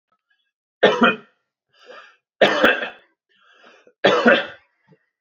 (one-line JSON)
{"three_cough_length": "5.2 s", "three_cough_amplitude": 27346, "three_cough_signal_mean_std_ratio": 0.36, "survey_phase": "alpha (2021-03-01 to 2021-08-12)", "age": "18-44", "gender": "Male", "wearing_mask": "No", "symptom_cough_any": true, "symptom_headache": true, "symptom_onset": "3 days", "smoker_status": "Never smoked", "respiratory_condition_asthma": false, "respiratory_condition_other": false, "recruitment_source": "Test and Trace", "submission_delay": "0 days", "covid_test_result": "Positive", "covid_test_method": "RT-qPCR"}